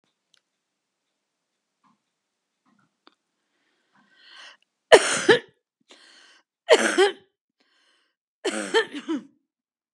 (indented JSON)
{
  "three_cough_length": "9.9 s",
  "three_cough_amplitude": 32768,
  "three_cough_signal_mean_std_ratio": 0.24,
  "survey_phase": "beta (2021-08-13 to 2022-03-07)",
  "age": "65+",
  "gender": "Female",
  "wearing_mask": "No",
  "symptom_cough_any": true,
  "symptom_runny_or_blocked_nose": true,
  "symptom_sore_throat": true,
  "symptom_diarrhoea": true,
  "symptom_fatigue": true,
  "symptom_headache": true,
  "symptom_other": true,
  "symptom_onset": "5 days",
  "smoker_status": "Never smoked",
  "respiratory_condition_asthma": false,
  "respiratory_condition_other": false,
  "recruitment_source": "Test and Trace",
  "submission_delay": "2 days",
  "covid_test_result": "Positive",
  "covid_test_method": "RT-qPCR",
  "covid_ct_value": 14.2,
  "covid_ct_gene": "N gene"
}